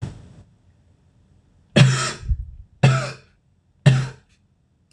{"three_cough_length": "4.9 s", "three_cough_amplitude": 26028, "three_cough_signal_mean_std_ratio": 0.36, "survey_phase": "beta (2021-08-13 to 2022-03-07)", "age": "18-44", "gender": "Male", "wearing_mask": "No", "symptom_cough_any": true, "symptom_runny_or_blocked_nose": true, "symptom_sore_throat": true, "symptom_fatigue": true, "symptom_headache": true, "symptom_change_to_sense_of_smell_or_taste": true, "smoker_status": "Never smoked", "respiratory_condition_asthma": false, "respiratory_condition_other": false, "recruitment_source": "Test and Trace", "submission_delay": "2 days", "covid_test_result": "Positive", "covid_test_method": "LFT"}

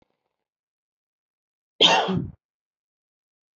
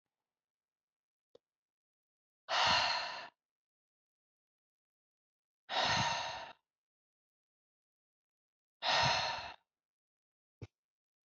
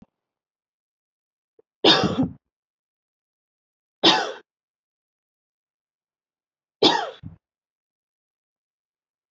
{"cough_length": "3.6 s", "cough_amplitude": 23216, "cough_signal_mean_std_ratio": 0.26, "exhalation_length": "11.3 s", "exhalation_amplitude": 4113, "exhalation_signal_mean_std_ratio": 0.33, "three_cough_length": "9.3 s", "three_cough_amplitude": 25104, "three_cough_signal_mean_std_ratio": 0.23, "survey_phase": "beta (2021-08-13 to 2022-03-07)", "age": "18-44", "gender": "Female", "wearing_mask": "No", "symptom_runny_or_blocked_nose": true, "symptom_sore_throat": true, "symptom_fatigue": true, "smoker_status": "Never smoked", "respiratory_condition_asthma": false, "respiratory_condition_other": false, "recruitment_source": "Test and Trace", "submission_delay": "1 day", "covid_test_result": "Positive", "covid_test_method": "RT-qPCR", "covid_ct_value": 26.5, "covid_ct_gene": "ORF1ab gene"}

